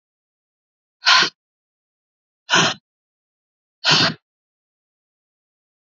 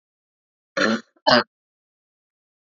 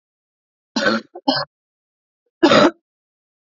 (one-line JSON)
{"exhalation_length": "5.8 s", "exhalation_amplitude": 29604, "exhalation_signal_mean_std_ratio": 0.28, "cough_length": "2.6 s", "cough_amplitude": 27345, "cough_signal_mean_std_ratio": 0.28, "three_cough_length": "3.5 s", "three_cough_amplitude": 28072, "three_cough_signal_mean_std_ratio": 0.33, "survey_phase": "alpha (2021-03-01 to 2021-08-12)", "age": "18-44", "gender": "Female", "wearing_mask": "No", "symptom_cough_any": true, "symptom_fatigue": true, "symptom_change_to_sense_of_smell_or_taste": true, "symptom_loss_of_taste": true, "smoker_status": "Never smoked", "respiratory_condition_asthma": false, "respiratory_condition_other": false, "recruitment_source": "Test and Trace", "submission_delay": "2 days", "covid_test_result": "Positive", "covid_test_method": "RT-qPCR", "covid_ct_value": 14.8, "covid_ct_gene": "N gene", "covid_ct_mean": 15.0, "covid_viral_load": "12000000 copies/ml", "covid_viral_load_category": "High viral load (>1M copies/ml)"}